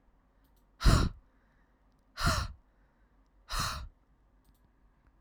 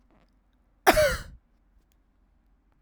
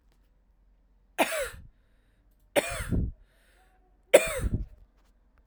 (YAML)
exhalation_length: 5.2 s
exhalation_amplitude: 9975
exhalation_signal_mean_std_ratio: 0.31
cough_length: 2.8 s
cough_amplitude: 23165
cough_signal_mean_std_ratio: 0.26
three_cough_length: 5.5 s
three_cough_amplitude: 26391
three_cough_signal_mean_std_ratio: 0.32
survey_phase: alpha (2021-03-01 to 2021-08-12)
age: 18-44
gender: Female
wearing_mask: 'No'
symptom_cough_any: true
symptom_fatigue: true
symptom_headache: true
symptom_change_to_sense_of_smell_or_taste: true
symptom_loss_of_taste: true
symptom_onset: 2 days
smoker_status: Never smoked
respiratory_condition_asthma: false
respiratory_condition_other: false
recruitment_source: Test and Trace
submission_delay: 2 days
covid_test_result: Positive
covid_test_method: RT-qPCR
covid_ct_value: 16.3
covid_ct_gene: ORF1ab gene
covid_ct_mean: 16.9
covid_viral_load: 3000000 copies/ml
covid_viral_load_category: High viral load (>1M copies/ml)